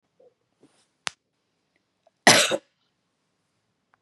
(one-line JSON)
{"cough_length": "4.0 s", "cough_amplitude": 31008, "cough_signal_mean_std_ratio": 0.19, "survey_phase": "beta (2021-08-13 to 2022-03-07)", "age": "45-64", "gender": "Female", "wearing_mask": "No", "symptom_none": true, "smoker_status": "Ex-smoker", "respiratory_condition_asthma": false, "respiratory_condition_other": false, "recruitment_source": "REACT", "submission_delay": "2 days", "covid_test_result": "Negative", "covid_test_method": "RT-qPCR", "influenza_a_test_result": "Negative", "influenza_b_test_result": "Negative"}